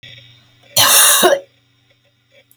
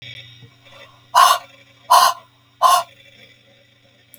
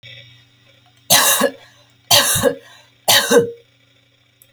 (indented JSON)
{
  "cough_length": "2.6 s",
  "cough_amplitude": 32768,
  "cough_signal_mean_std_ratio": 0.43,
  "exhalation_length": "4.2 s",
  "exhalation_amplitude": 30117,
  "exhalation_signal_mean_std_ratio": 0.35,
  "three_cough_length": "4.5 s",
  "three_cough_amplitude": 32768,
  "three_cough_signal_mean_std_ratio": 0.44,
  "survey_phase": "alpha (2021-03-01 to 2021-08-12)",
  "age": "45-64",
  "gender": "Female",
  "wearing_mask": "No",
  "symptom_none": true,
  "smoker_status": "Never smoked",
  "respiratory_condition_asthma": false,
  "respiratory_condition_other": false,
  "recruitment_source": "REACT",
  "submission_delay": "28 days",
  "covid_test_result": "Negative",
  "covid_test_method": "RT-qPCR"
}